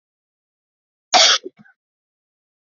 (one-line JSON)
{"cough_length": "2.6 s", "cough_amplitude": 30087, "cough_signal_mean_std_ratio": 0.25, "survey_phase": "beta (2021-08-13 to 2022-03-07)", "age": "18-44", "gender": "Female", "wearing_mask": "No", "symptom_cough_any": true, "symptom_runny_or_blocked_nose": true, "symptom_fatigue": true, "symptom_onset": "6 days", "smoker_status": "Never smoked", "respiratory_condition_asthma": false, "respiratory_condition_other": false, "recruitment_source": "REACT", "submission_delay": "1 day", "covid_test_result": "Positive", "covid_test_method": "RT-qPCR", "covid_ct_value": 27.0, "covid_ct_gene": "E gene", "influenza_a_test_result": "Negative", "influenza_b_test_result": "Negative"}